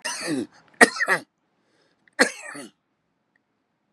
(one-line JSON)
{"three_cough_length": "3.9 s", "three_cough_amplitude": 32768, "three_cough_signal_mean_std_ratio": 0.28, "survey_phase": "beta (2021-08-13 to 2022-03-07)", "age": "65+", "gender": "Male", "wearing_mask": "No", "symptom_cough_any": true, "symptom_onset": "5 days", "smoker_status": "Never smoked", "respiratory_condition_asthma": false, "respiratory_condition_other": false, "recruitment_source": "Test and Trace", "submission_delay": "2 days", "covid_test_result": "Positive", "covid_test_method": "ePCR"}